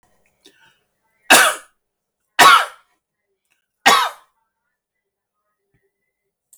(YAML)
cough_length: 6.6 s
cough_amplitude: 32768
cough_signal_mean_std_ratio: 0.26
survey_phase: alpha (2021-03-01 to 2021-08-12)
age: 65+
gender: Male
wearing_mask: 'No'
symptom_abdominal_pain: true
smoker_status: Never smoked
respiratory_condition_asthma: false
respiratory_condition_other: false
recruitment_source: REACT
submission_delay: 8 days
covid_test_result: Negative
covid_test_method: RT-qPCR